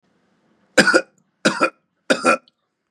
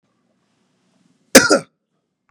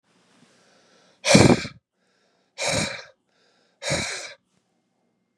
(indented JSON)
{
  "three_cough_length": "2.9 s",
  "three_cough_amplitude": 32768,
  "three_cough_signal_mean_std_ratio": 0.35,
  "cough_length": "2.3 s",
  "cough_amplitude": 32768,
  "cough_signal_mean_std_ratio": 0.22,
  "exhalation_length": "5.4 s",
  "exhalation_amplitude": 32152,
  "exhalation_signal_mean_std_ratio": 0.29,
  "survey_phase": "beta (2021-08-13 to 2022-03-07)",
  "age": "45-64",
  "gender": "Male",
  "wearing_mask": "No",
  "symptom_none": true,
  "smoker_status": "Ex-smoker",
  "respiratory_condition_asthma": false,
  "respiratory_condition_other": false,
  "recruitment_source": "REACT",
  "submission_delay": "1 day",
  "covid_test_result": "Negative",
  "covid_test_method": "RT-qPCR",
  "influenza_a_test_result": "Negative",
  "influenza_b_test_result": "Negative"
}